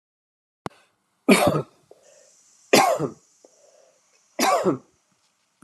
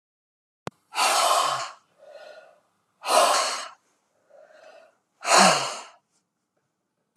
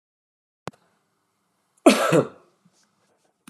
{"three_cough_length": "5.6 s", "three_cough_amplitude": 25966, "three_cough_signal_mean_std_ratio": 0.33, "exhalation_length": "7.2 s", "exhalation_amplitude": 24019, "exhalation_signal_mean_std_ratio": 0.4, "cough_length": "3.5 s", "cough_amplitude": 30894, "cough_signal_mean_std_ratio": 0.24, "survey_phase": "beta (2021-08-13 to 2022-03-07)", "age": "45-64", "gender": "Female", "wearing_mask": "No", "symptom_none": true, "smoker_status": "Never smoked", "respiratory_condition_asthma": false, "respiratory_condition_other": false, "recruitment_source": "REACT", "submission_delay": "2 days", "covid_test_result": "Negative", "covid_test_method": "RT-qPCR"}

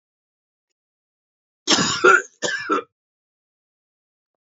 {"cough_length": "4.4 s", "cough_amplitude": 29628, "cough_signal_mean_std_ratio": 0.31, "survey_phase": "alpha (2021-03-01 to 2021-08-12)", "age": "18-44", "gender": "Male", "wearing_mask": "No", "symptom_cough_any": true, "symptom_fatigue": true, "symptom_fever_high_temperature": true, "smoker_status": "Never smoked", "respiratory_condition_asthma": false, "respiratory_condition_other": false, "recruitment_source": "Test and Trace", "submission_delay": "3 days", "covid_test_method": "RT-qPCR", "covid_ct_value": 32.5, "covid_ct_gene": "N gene", "covid_ct_mean": 32.5, "covid_viral_load": "22 copies/ml", "covid_viral_load_category": "Minimal viral load (< 10K copies/ml)"}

